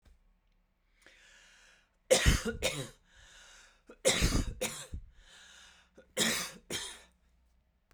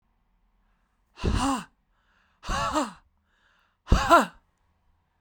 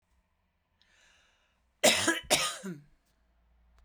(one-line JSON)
{"three_cough_length": "7.9 s", "three_cough_amplitude": 9654, "three_cough_signal_mean_std_ratio": 0.37, "exhalation_length": "5.2 s", "exhalation_amplitude": 21319, "exhalation_signal_mean_std_ratio": 0.34, "cough_length": "3.8 s", "cough_amplitude": 13202, "cough_signal_mean_std_ratio": 0.31, "survey_phase": "beta (2021-08-13 to 2022-03-07)", "age": "45-64", "gender": "Female", "wearing_mask": "No", "symptom_cough_any": true, "smoker_status": "Ex-smoker", "respiratory_condition_asthma": false, "respiratory_condition_other": false, "recruitment_source": "REACT", "submission_delay": "2 days", "covid_test_result": "Negative", "covid_test_method": "RT-qPCR"}